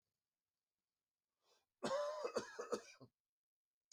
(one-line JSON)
{"cough_length": "3.9 s", "cough_amplitude": 1242, "cough_signal_mean_std_ratio": 0.37, "survey_phase": "beta (2021-08-13 to 2022-03-07)", "age": "45-64", "gender": "Male", "wearing_mask": "No", "symptom_new_continuous_cough": true, "symptom_shortness_of_breath": true, "symptom_sore_throat": true, "symptom_fatigue": true, "symptom_fever_high_temperature": true, "symptom_headache": true, "symptom_onset": "4 days", "smoker_status": "Never smoked", "respiratory_condition_asthma": false, "respiratory_condition_other": false, "recruitment_source": "Test and Trace", "submission_delay": "2 days", "covid_test_result": "Positive", "covid_test_method": "RT-qPCR"}